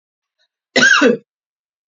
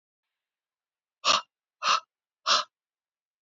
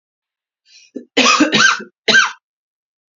{"cough_length": "1.9 s", "cough_amplitude": 30624, "cough_signal_mean_std_ratio": 0.39, "exhalation_length": "3.4 s", "exhalation_amplitude": 11660, "exhalation_signal_mean_std_ratio": 0.29, "three_cough_length": "3.2 s", "three_cough_amplitude": 31174, "three_cough_signal_mean_std_ratio": 0.43, "survey_phase": "beta (2021-08-13 to 2022-03-07)", "age": "45-64", "gender": "Female", "wearing_mask": "No", "symptom_cough_any": true, "symptom_new_continuous_cough": true, "symptom_runny_or_blocked_nose": true, "symptom_sore_throat": true, "symptom_headache": true, "symptom_other": true, "symptom_onset": "4 days", "smoker_status": "Ex-smoker", "respiratory_condition_asthma": false, "respiratory_condition_other": false, "recruitment_source": "Test and Trace", "submission_delay": "2 days", "covid_test_result": "Positive", "covid_test_method": "RT-qPCR", "covid_ct_value": 23.4, "covid_ct_gene": "ORF1ab gene", "covid_ct_mean": 24.0, "covid_viral_load": "13000 copies/ml", "covid_viral_load_category": "Low viral load (10K-1M copies/ml)"}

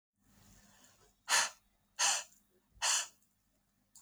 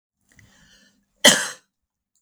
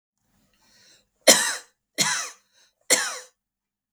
{"exhalation_length": "4.0 s", "exhalation_amplitude": 5050, "exhalation_signal_mean_std_ratio": 0.34, "cough_length": "2.2 s", "cough_amplitude": 32768, "cough_signal_mean_std_ratio": 0.22, "three_cough_length": "3.9 s", "three_cough_amplitude": 32768, "three_cough_signal_mean_std_ratio": 0.3, "survey_phase": "beta (2021-08-13 to 2022-03-07)", "age": "45-64", "gender": "Female", "wearing_mask": "No", "symptom_cough_any": true, "symptom_other": true, "smoker_status": "Ex-smoker", "respiratory_condition_asthma": false, "respiratory_condition_other": false, "recruitment_source": "Test and Trace", "submission_delay": "1 day", "covid_test_method": "RT-qPCR", "covid_ct_value": 24.6, "covid_ct_gene": "N gene"}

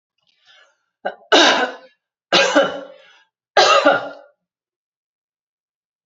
{"three_cough_length": "6.1 s", "three_cough_amplitude": 32767, "three_cough_signal_mean_std_ratio": 0.37, "survey_phase": "alpha (2021-03-01 to 2021-08-12)", "age": "45-64", "gender": "Female", "wearing_mask": "No", "symptom_fatigue": true, "symptom_onset": "13 days", "smoker_status": "Never smoked", "respiratory_condition_asthma": false, "respiratory_condition_other": false, "recruitment_source": "REACT", "submission_delay": "2 days", "covid_test_result": "Negative", "covid_test_method": "RT-qPCR"}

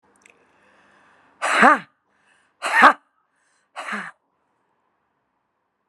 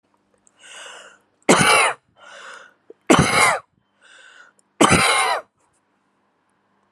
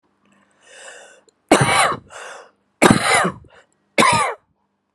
{"exhalation_length": "5.9 s", "exhalation_amplitude": 32768, "exhalation_signal_mean_std_ratio": 0.25, "three_cough_length": "6.9 s", "three_cough_amplitude": 32683, "three_cough_signal_mean_std_ratio": 0.39, "cough_length": "4.9 s", "cough_amplitude": 32768, "cough_signal_mean_std_ratio": 0.41, "survey_phase": "alpha (2021-03-01 to 2021-08-12)", "age": "45-64", "gender": "Female", "wearing_mask": "No", "symptom_shortness_of_breath": true, "symptom_fatigue": true, "symptom_onset": "4 days", "smoker_status": "Current smoker (e-cigarettes or vapes only)", "respiratory_condition_asthma": false, "respiratory_condition_other": false, "recruitment_source": "REACT", "submission_delay": "1 day", "covid_test_result": "Negative", "covid_test_method": "RT-qPCR"}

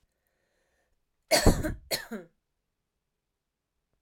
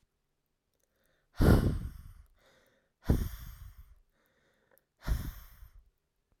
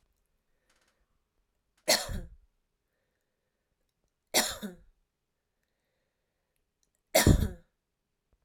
{"cough_length": "4.0 s", "cough_amplitude": 17939, "cough_signal_mean_std_ratio": 0.25, "exhalation_length": "6.4 s", "exhalation_amplitude": 10646, "exhalation_signal_mean_std_ratio": 0.3, "three_cough_length": "8.4 s", "three_cough_amplitude": 13886, "three_cough_signal_mean_std_ratio": 0.22, "survey_phase": "alpha (2021-03-01 to 2021-08-12)", "age": "18-44", "gender": "Female", "wearing_mask": "No", "symptom_none": true, "smoker_status": "Never smoked", "respiratory_condition_asthma": false, "respiratory_condition_other": false, "recruitment_source": "REACT", "submission_delay": "1 day", "covid_test_result": "Negative", "covid_test_method": "RT-qPCR"}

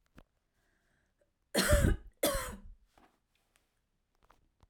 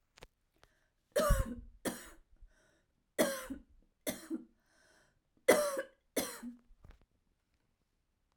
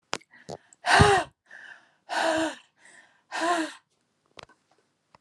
{"cough_length": "4.7 s", "cough_amplitude": 7241, "cough_signal_mean_std_ratio": 0.31, "three_cough_length": "8.4 s", "three_cough_amplitude": 8349, "three_cough_signal_mean_std_ratio": 0.32, "exhalation_length": "5.2 s", "exhalation_amplitude": 21548, "exhalation_signal_mean_std_ratio": 0.37, "survey_phase": "alpha (2021-03-01 to 2021-08-12)", "age": "18-44", "gender": "Female", "wearing_mask": "No", "symptom_cough_any": true, "smoker_status": "Never smoked", "respiratory_condition_asthma": true, "respiratory_condition_other": false, "recruitment_source": "REACT", "submission_delay": "2 days", "covid_test_result": "Negative", "covid_test_method": "RT-qPCR"}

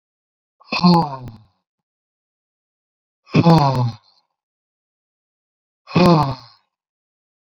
{"exhalation_length": "7.4 s", "exhalation_amplitude": 28049, "exhalation_signal_mean_std_ratio": 0.34, "survey_phase": "beta (2021-08-13 to 2022-03-07)", "age": "65+", "gender": "Male", "wearing_mask": "No", "symptom_none": true, "smoker_status": "Never smoked", "respiratory_condition_asthma": false, "respiratory_condition_other": false, "recruitment_source": "REACT", "submission_delay": "2 days", "covid_test_result": "Negative", "covid_test_method": "RT-qPCR"}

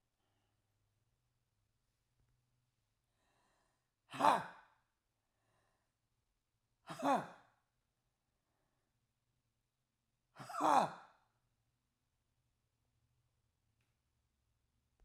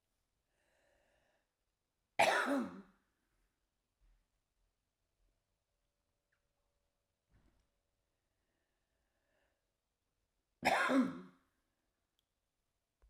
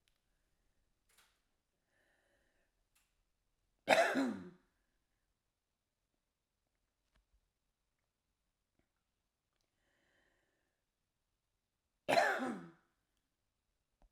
{"exhalation_length": "15.0 s", "exhalation_amplitude": 5702, "exhalation_signal_mean_std_ratio": 0.18, "cough_length": "13.1 s", "cough_amplitude": 5283, "cough_signal_mean_std_ratio": 0.22, "three_cough_length": "14.1 s", "three_cough_amplitude": 7755, "three_cough_signal_mean_std_ratio": 0.2, "survey_phase": "alpha (2021-03-01 to 2021-08-12)", "age": "65+", "gender": "Female", "wearing_mask": "No", "symptom_none": true, "smoker_status": "Never smoked", "respiratory_condition_asthma": true, "respiratory_condition_other": false, "recruitment_source": "REACT", "submission_delay": "9 days", "covid_test_result": "Negative", "covid_test_method": "RT-qPCR"}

